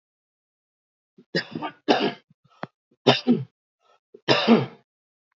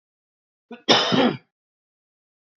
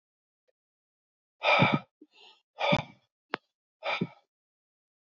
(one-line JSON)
{"three_cough_length": "5.4 s", "three_cough_amplitude": 26240, "three_cough_signal_mean_std_ratio": 0.33, "cough_length": "2.6 s", "cough_amplitude": 27553, "cough_signal_mean_std_ratio": 0.33, "exhalation_length": "5.0 s", "exhalation_amplitude": 11380, "exhalation_signal_mean_std_ratio": 0.3, "survey_phase": "beta (2021-08-13 to 2022-03-07)", "age": "45-64", "gender": "Male", "wearing_mask": "No", "symptom_new_continuous_cough": true, "symptom_runny_or_blocked_nose": true, "symptom_shortness_of_breath": true, "symptom_fever_high_temperature": true, "symptom_onset": "2 days", "smoker_status": "Ex-smoker", "respiratory_condition_asthma": false, "respiratory_condition_other": false, "recruitment_source": "Test and Trace", "submission_delay": "1 day", "covid_test_result": "Positive", "covid_test_method": "RT-qPCR", "covid_ct_value": 16.2, "covid_ct_gene": "ORF1ab gene", "covid_ct_mean": 16.7, "covid_viral_load": "3200000 copies/ml", "covid_viral_load_category": "High viral load (>1M copies/ml)"}